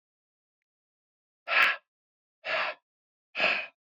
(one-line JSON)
{"exhalation_length": "3.9 s", "exhalation_amplitude": 11914, "exhalation_signal_mean_std_ratio": 0.35, "survey_phase": "beta (2021-08-13 to 2022-03-07)", "age": "65+", "gender": "Male", "wearing_mask": "No", "symptom_none": true, "smoker_status": "Ex-smoker", "respiratory_condition_asthma": false, "respiratory_condition_other": false, "recruitment_source": "REACT", "submission_delay": "2 days", "covid_test_result": "Negative", "covid_test_method": "RT-qPCR"}